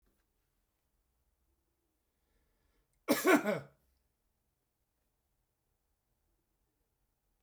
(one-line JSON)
{"cough_length": "7.4 s", "cough_amplitude": 6871, "cough_signal_mean_std_ratio": 0.19, "survey_phase": "beta (2021-08-13 to 2022-03-07)", "age": "65+", "gender": "Male", "wearing_mask": "No", "symptom_none": true, "smoker_status": "Ex-smoker", "respiratory_condition_asthma": false, "respiratory_condition_other": false, "recruitment_source": "REACT", "submission_delay": "8 days", "covid_test_result": "Negative", "covid_test_method": "RT-qPCR"}